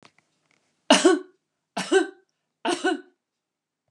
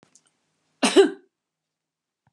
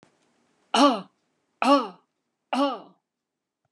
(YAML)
three_cough_length: 3.9 s
three_cough_amplitude: 28500
three_cough_signal_mean_std_ratio: 0.33
cough_length: 2.3 s
cough_amplitude: 19913
cough_signal_mean_std_ratio: 0.25
exhalation_length: 3.7 s
exhalation_amplitude: 18756
exhalation_signal_mean_std_ratio: 0.33
survey_phase: beta (2021-08-13 to 2022-03-07)
age: 45-64
gender: Female
wearing_mask: 'No'
symptom_none: true
smoker_status: Never smoked
respiratory_condition_asthma: false
respiratory_condition_other: false
recruitment_source: REACT
submission_delay: 4 days
covid_test_result: Negative
covid_test_method: RT-qPCR